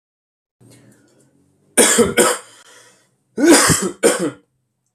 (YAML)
cough_length: 4.9 s
cough_amplitude: 32768
cough_signal_mean_std_ratio: 0.42
survey_phase: alpha (2021-03-01 to 2021-08-12)
age: 18-44
gender: Male
wearing_mask: 'No'
symptom_none: true
smoker_status: Ex-smoker
respiratory_condition_asthma: false
respiratory_condition_other: false
recruitment_source: REACT
submission_delay: 1 day
covid_test_result: Negative
covid_test_method: RT-qPCR